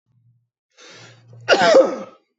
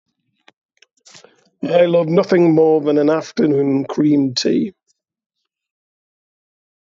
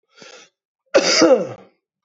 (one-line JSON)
{"cough_length": "2.4 s", "cough_amplitude": 25716, "cough_signal_mean_std_ratio": 0.37, "exhalation_length": "7.0 s", "exhalation_amplitude": 25720, "exhalation_signal_mean_std_ratio": 0.56, "three_cough_length": "2.0 s", "three_cough_amplitude": 26023, "three_cough_signal_mean_std_ratio": 0.41, "survey_phase": "beta (2021-08-13 to 2022-03-07)", "age": "45-64", "gender": "Male", "wearing_mask": "No", "symptom_cough_any": true, "symptom_runny_or_blocked_nose": true, "symptom_abdominal_pain": true, "symptom_fever_high_temperature": true, "symptom_headache": true, "symptom_change_to_sense_of_smell_or_taste": true, "symptom_loss_of_taste": true, "symptom_onset": "3 days", "smoker_status": "Ex-smoker", "respiratory_condition_asthma": false, "respiratory_condition_other": false, "recruitment_source": "Test and Trace", "submission_delay": "1 day", "covid_test_result": "Positive", "covid_test_method": "RT-qPCR"}